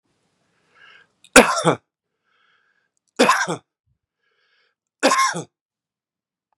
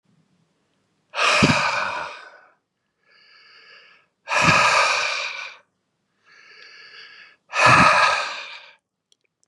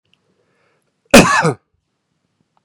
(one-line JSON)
{"three_cough_length": "6.6 s", "three_cough_amplitude": 32768, "three_cough_signal_mean_std_ratio": 0.27, "exhalation_length": "9.5 s", "exhalation_amplitude": 30001, "exhalation_signal_mean_std_ratio": 0.44, "cough_length": "2.6 s", "cough_amplitude": 32768, "cough_signal_mean_std_ratio": 0.28, "survey_phase": "beta (2021-08-13 to 2022-03-07)", "age": "65+", "gender": "Male", "wearing_mask": "No", "symptom_none": true, "smoker_status": "Never smoked", "respiratory_condition_asthma": false, "respiratory_condition_other": false, "recruitment_source": "REACT", "submission_delay": "1 day", "covid_test_result": "Negative", "covid_test_method": "RT-qPCR", "influenza_a_test_result": "Negative", "influenza_b_test_result": "Negative"}